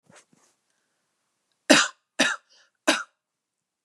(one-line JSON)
{"three_cough_length": "3.8 s", "three_cough_amplitude": 32224, "three_cough_signal_mean_std_ratio": 0.25, "survey_phase": "beta (2021-08-13 to 2022-03-07)", "age": "18-44", "gender": "Female", "wearing_mask": "No", "symptom_none": true, "smoker_status": "Never smoked", "respiratory_condition_asthma": false, "respiratory_condition_other": false, "recruitment_source": "REACT", "submission_delay": "2 days", "covid_test_result": "Negative", "covid_test_method": "RT-qPCR", "influenza_a_test_result": "Negative", "influenza_b_test_result": "Negative"}